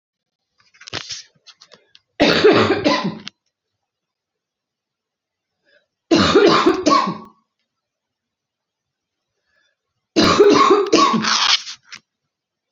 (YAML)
three_cough_length: 12.7 s
three_cough_amplitude: 30983
three_cough_signal_mean_std_ratio: 0.42
survey_phase: beta (2021-08-13 to 2022-03-07)
age: 45-64
gender: Female
wearing_mask: 'No'
symptom_cough_any: true
symptom_new_continuous_cough: true
symptom_runny_or_blocked_nose: true
symptom_sore_throat: true
symptom_diarrhoea: true
symptom_fatigue: true
symptom_headache: true
symptom_onset: 2 days
smoker_status: Never smoked
respiratory_condition_asthma: false
respiratory_condition_other: false
recruitment_source: Test and Trace
submission_delay: 1 day
covid_test_result: Positive
covid_test_method: RT-qPCR
covid_ct_value: 17.9
covid_ct_gene: ORF1ab gene
covid_ct_mean: 18.4
covid_viral_load: 950000 copies/ml
covid_viral_load_category: Low viral load (10K-1M copies/ml)